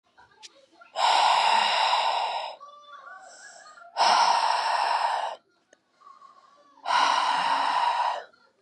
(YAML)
exhalation_length: 8.6 s
exhalation_amplitude: 11948
exhalation_signal_mean_std_ratio: 0.67
survey_phase: beta (2021-08-13 to 2022-03-07)
age: 18-44
gender: Female
wearing_mask: 'No'
symptom_headache: true
symptom_change_to_sense_of_smell_or_taste: true
smoker_status: Ex-smoker
respiratory_condition_asthma: false
respiratory_condition_other: false
recruitment_source: REACT
submission_delay: 2 days
covid_test_result: Negative
covid_test_method: RT-qPCR
influenza_a_test_result: Negative
influenza_b_test_result: Negative